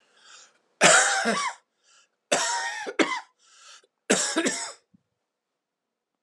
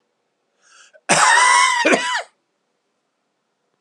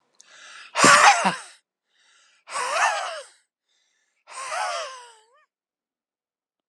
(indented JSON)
{
  "three_cough_length": "6.2 s",
  "three_cough_amplitude": 23460,
  "three_cough_signal_mean_std_ratio": 0.42,
  "cough_length": "3.8 s",
  "cough_amplitude": 30611,
  "cough_signal_mean_std_ratio": 0.45,
  "exhalation_length": "6.7 s",
  "exhalation_amplitude": 29381,
  "exhalation_signal_mean_std_ratio": 0.34,
  "survey_phase": "alpha (2021-03-01 to 2021-08-12)",
  "age": "45-64",
  "gender": "Male",
  "wearing_mask": "No",
  "symptom_cough_any": true,
  "symptom_fatigue": true,
  "symptom_fever_high_temperature": true,
  "symptom_change_to_sense_of_smell_or_taste": true,
  "symptom_loss_of_taste": true,
  "symptom_onset": "3 days",
  "smoker_status": "Never smoked",
  "respiratory_condition_asthma": false,
  "respiratory_condition_other": false,
  "recruitment_source": "Test and Trace",
  "submission_delay": "1 day",
  "covid_test_result": "Positive",
  "covid_test_method": "RT-qPCR"
}